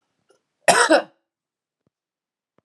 {"cough_length": "2.6 s", "cough_amplitude": 30381, "cough_signal_mean_std_ratio": 0.27, "survey_phase": "alpha (2021-03-01 to 2021-08-12)", "age": "45-64", "gender": "Female", "wearing_mask": "No", "symptom_none": true, "smoker_status": "Never smoked", "respiratory_condition_asthma": false, "respiratory_condition_other": false, "recruitment_source": "Test and Trace", "submission_delay": "2 days", "covid_test_result": "Positive", "covid_test_method": "RT-qPCR", "covid_ct_value": 22.8, "covid_ct_gene": "ORF1ab gene"}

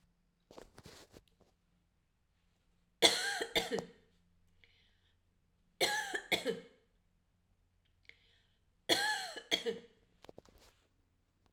{"three_cough_length": "11.5 s", "three_cough_amplitude": 11713, "three_cough_signal_mean_std_ratio": 0.31, "survey_phase": "alpha (2021-03-01 to 2021-08-12)", "age": "18-44", "gender": "Female", "wearing_mask": "No", "symptom_none": true, "smoker_status": "Ex-smoker", "respiratory_condition_asthma": false, "respiratory_condition_other": false, "recruitment_source": "REACT", "submission_delay": "1 day", "covid_test_result": "Negative", "covid_test_method": "RT-qPCR"}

